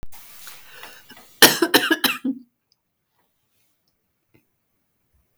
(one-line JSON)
{"cough_length": "5.4 s", "cough_amplitude": 32768, "cough_signal_mean_std_ratio": 0.27, "survey_phase": "beta (2021-08-13 to 2022-03-07)", "age": "45-64", "gender": "Female", "wearing_mask": "No", "symptom_cough_any": true, "symptom_onset": "7 days", "smoker_status": "Ex-smoker", "respiratory_condition_asthma": false, "respiratory_condition_other": false, "recruitment_source": "REACT", "submission_delay": "1 day", "covid_test_result": "Negative", "covid_test_method": "RT-qPCR", "influenza_a_test_result": "Negative", "influenza_b_test_result": "Negative"}